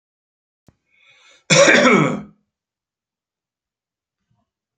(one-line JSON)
{"cough_length": "4.8 s", "cough_amplitude": 31982, "cough_signal_mean_std_ratio": 0.3, "survey_phase": "beta (2021-08-13 to 2022-03-07)", "age": "65+", "gender": "Male", "wearing_mask": "No", "symptom_none": true, "smoker_status": "Never smoked", "respiratory_condition_asthma": false, "respiratory_condition_other": false, "recruitment_source": "REACT", "submission_delay": "2 days", "covid_test_result": "Negative", "covid_test_method": "RT-qPCR"}